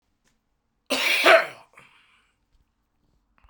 {
  "cough_length": "3.5 s",
  "cough_amplitude": 29882,
  "cough_signal_mean_std_ratio": 0.29,
  "survey_phase": "beta (2021-08-13 to 2022-03-07)",
  "age": "65+",
  "gender": "Male",
  "wearing_mask": "No",
  "symptom_cough_any": true,
  "symptom_runny_or_blocked_nose": true,
  "symptom_onset": "3 days",
  "smoker_status": "Ex-smoker",
  "respiratory_condition_asthma": false,
  "respiratory_condition_other": false,
  "recruitment_source": "Test and Trace",
  "submission_delay": "1 day",
  "covid_test_result": "Positive",
  "covid_test_method": "RT-qPCR",
  "covid_ct_value": 25.2,
  "covid_ct_gene": "ORF1ab gene"
}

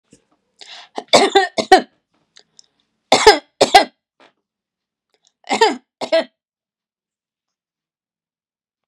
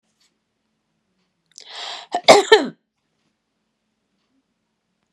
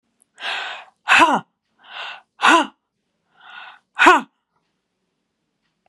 {
  "three_cough_length": "8.9 s",
  "three_cough_amplitude": 32768,
  "three_cough_signal_mean_std_ratio": 0.27,
  "cough_length": "5.1 s",
  "cough_amplitude": 32768,
  "cough_signal_mean_std_ratio": 0.2,
  "exhalation_length": "5.9 s",
  "exhalation_amplitude": 32767,
  "exhalation_signal_mean_std_ratio": 0.32,
  "survey_phase": "beta (2021-08-13 to 2022-03-07)",
  "age": "65+",
  "gender": "Female",
  "wearing_mask": "No",
  "symptom_cough_any": true,
  "symptom_sore_throat": true,
  "smoker_status": "Never smoked",
  "respiratory_condition_asthma": true,
  "respiratory_condition_other": false,
  "recruitment_source": "REACT",
  "submission_delay": "1 day",
  "covid_test_result": "Negative",
  "covid_test_method": "RT-qPCR"
}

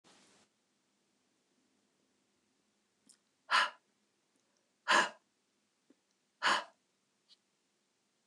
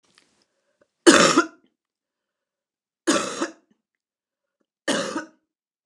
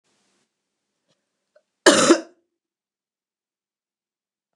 {
  "exhalation_length": "8.3 s",
  "exhalation_amplitude": 6301,
  "exhalation_signal_mean_std_ratio": 0.21,
  "three_cough_length": "5.9 s",
  "three_cough_amplitude": 29203,
  "three_cough_signal_mean_std_ratio": 0.28,
  "cough_length": "4.6 s",
  "cough_amplitude": 29203,
  "cough_signal_mean_std_ratio": 0.2,
  "survey_phase": "beta (2021-08-13 to 2022-03-07)",
  "age": "65+",
  "gender": "Female",
  "wearing_mask": "No",
  "symptom_cough_any": true,
  "smoker_status": "Never smoked",
  "respiratory_condition_asthma": false,
  "respiratory_condition_other": false,
  "recruitment_source": "REACT",
  "submission_delay": "5 days",
  "covid_test_result": "Negative",
  "covid_test_method": "RT-qPCR",
  "influenza_a_test_result": "Negative",
  "influenza_b_test_result": "Negative"
}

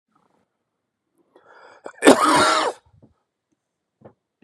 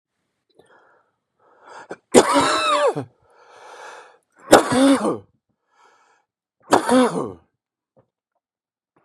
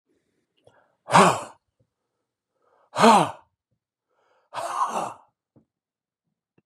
{
  "cough_length": "4.4 s",
  "cough_amplitude": 32768,
  "cough_signal_mean_std_ratio": 0.3,
  "three_cough_length": "9.0 s",
  "three_cough_amplitude": 32768,
  "three_cough_signal_mean_std_ratio": 0.35,
  "exhalation_length": "6.7 s",
  "exhalation_amplitude": 28942,
  "exhalation_signal_mean_std_ratio": 0.28,
  "survey_phase": "beta (2021-08-13 to 2022-03-07)",
  "age": "65+",
  "gender": "Male",
  "wearing_mask": "No",
  "symptom_cough_any": true,
  "symptom_fatigue": true,
  "symptom_headache": true,
  "symptom_other": true,
  "symptom_onset": "2 days",
  "smoker_status": "Ex-smoker",
  "respiratory_condition_asthma": false,
  "respiratory_condition_other": false,
  "recruitment_source": "Test and Trace",
  "submission_delay": "1 day",
  "covid_test_result": "Positive",
  "covid_test_method": "RT-qPCR",
  "covid_ct_value": 18.7,
  "covid_ct_gene": "N gene"
}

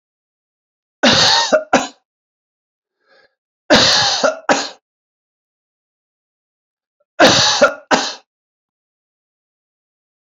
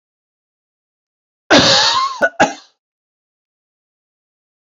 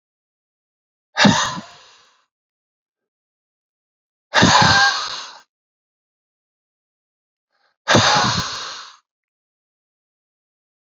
{
  "three_cough_length": "10.2 s",
  "three_cough_amplitude": 32768,
  "three_cough_signal_mean_std_ratio": 0.37,
  "cough_length": "4.6 s",
  "cough_amplitude": 31265,
  "cough_signal_mean_std_ratio": 0.34,
  "exhalation_length": "10.8 s",
  "exhalation_amplitude": 32536,
  "exhalation_signal_mean_std_ratio": 0.33,
  "survey_phase": "beta (2021-08-13 to 2022-03-07)",
  "age": "45-64",
  "gender": "Male",
  "wearing_mask": "No",
  "symptom_none": true,
  "smoker_status": "Never smoked",
  "respiratory_condition_asthma": false,
  "respiratory_condition_other": false,
  "recruitment_source": "REACT",
  "submission_delay": "2 days",
  "covid_test_result": "Negative",
  "covid_test_method": "RT-qPCR"
}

